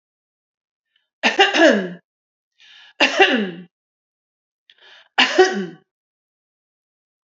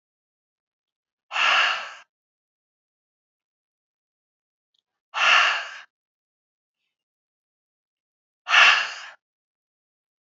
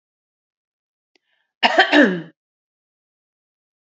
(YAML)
three_cough_length: 7.3 s
three_cough_amplitude: 30008
three_cough_signal_mean_std_ratio: 0.34
exhalation_length: 10.2 s
exhalation_amplitude: 23728
exhalation_signal_mean_std_ratio: 0.28
cough_length: 3.9 s
cough_amplitude: 28783
cough_signal_mean_std_ratio: 0.27
survey_phase: alpha (2021-03-01 to 2021-08-12)
age: 45-64
gender: Female
wearing_mask: 'No'
symptom_none: true
smoker_status: Ex-smoker
respiratory_condition_asthma: false
respiratory_condition_other: false
recruitment_source: REACT
submission_delay: 1 day
covid_test_result: Negative
covid_test_method: RT-qPCR